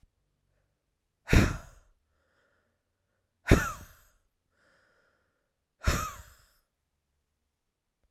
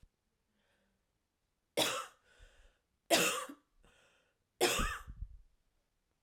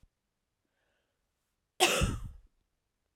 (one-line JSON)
{"exhalation_length": "8.1 s", "exhalation_amplitude": 16314, "exhalation_signal_mean_std_ratio": 0.21, "three_cough_length": "6.2 s", "three_cough_amplitude": 6044, "three_cough_signal_mean_std_ratio": 0.33, "cough_length": "3.2 s", "cough_amplitude": 11585, "cough_signal_mean_std_ratio": 0.28, "survey_phase": "beta (2021-08-13 to 2022-03-07)", "age": "18-44", "gender": "Female", "wearing_mask": "No", "symptom_runny_or_blocked_nose": true, "symptom_onset": "4 days", "smoker_status": "Never smoked", "respiratory_condition_asthma": true, "respiratory_condition_other": false, "recruitment_source": "REACT", "submission_delay": "1 day", "covid_test_result": "Negative", "covid_test_method": "RT-qPCR"}